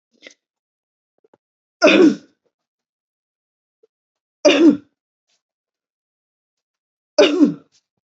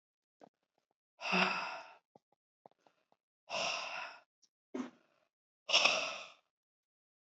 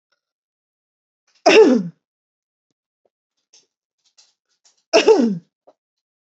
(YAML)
three_cough_length: 8.2 s
three_cough_amplitude: 30967
three_cough_signal_mean_std_ratio: 0.28
exhalation_length: 7.3 s
exhalation_amplitude: 6985
exhalation_signal_mean_std_ratio: 0.35
cough_length: 6.4 s
cough_amplitude: 31806
cough_signal_mean_std_ratio: 0.28
survey_phase: beta (2021-08-13 to 2022-03-07)
age: 18-44
gender: Female
wearing_mask: 'No'
symptom_none: true
symptom_onset: 5 days
smoker_status: Never smoked
respiratory_condition_asthma: true
respiratory_condition_other: false
recruitment_source: REACT
submission_delay: 1 day
covid_test_result: Negative
covid_test_method: RT-qPCR
influenza_a_test_result: Negative
influenza_b_test_result: Negative